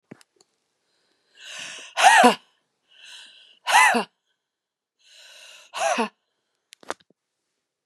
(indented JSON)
{
  "exhalation_length": "7.9 s",
  "exhalation_amplitude": 28447,
  "exhalation_signal_mean_std_ratio": 0.29,
  "survey_phase": "beta (2021-08-13 to 2022-03-07)",
  "age": "45-64",
  "gender": "Female",
  "wearing_mask": "No",
  "symptom_none": true,
  "smoker_status": "Never smoked",
  "respiratory_condition_asthma": true,
  "respiratory_condition_other": false,
  "recruitment_source": "REACT",
  "submission_delay": "2 days",
  "covid_test_result": "Negative",
  "covid_test_method": "RT-qPCR",
  "influenza_a_test_result": "Negative",
  "influenza_b_test_result": "Negative"
}